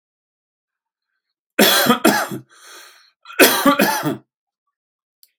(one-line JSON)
{"cough_length": "5.4 s", "cough_amplitude": 32768, "cough_signal_mean_std_ratio": 0.4, "survey_phase": "alpha (2021-03-01 to 2021-08-12)", "age": "65+", "gender": "Male", "wearing_mask": "No", "symptom_none": true, "smoker_status": "Ex-smoker", "respiratory_condition_asthma": false, "respiratory_condition_other": false, "recruitment_source": "REACT", "submission_delay": "1 day", "covid_test_result": "Negative", "covid_test_method": "RT-qPCR"}